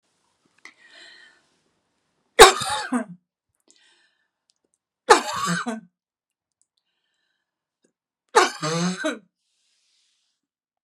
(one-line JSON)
{"three_cough_length": "10.8 s", "three_cough_amplitude": 32768, "three_cough_signal_mean_std_ratio": 0.23, "survey_phase": "beta (2021-08-13 to 2022-03-07)", "age": "45-64", "gender": "Female", "wearing_mask": "No", "symptom_fatigue": true, "symptom_change_to_sense_of_smell_or_taste": true, "symptom_onset": "12 days", "smoker_status": "Never smoked", "respiratory_condition_asthma": false, "respiratory_condition_other": false, "recruitment_source": "REACT", "submission_delay": "2 days", "covid_test_result": "Negative", "covid_test_method": "RT-qPCR", "influenza_a_test_result": "Negative", "influenza_b_test_result": "Negative"}